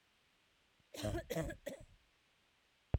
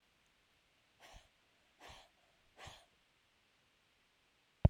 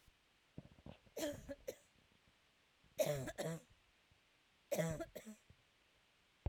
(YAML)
cough_length: 3.0 s
cough_amplitude: 2872
cough_signal_mean_std_ratio: 0.36
exhalation_length: 4.7 s
exhalation_amplitude: 7607
exhalation_signal_mean_std_ratio: 0.1
three_cough_length: 6.5 s
three_cough_amplitude: 1940
three_cough_signal_mean_std_ratio: 0.39
survey_phase: beta (2021-08-13 to 2022-03-07)
age: 18-44
gender: Female
wearing_mask: 'No'
symptom_cough_any: true
symptom_other: true
smoker_status: Never smoked
respiratory_condition_asthma: false
respiratory_condition_other: false
recruitment_source: REACT
submission_delay: 1 day
covid_test_result: Negative
covid_test_method: RT-qPCR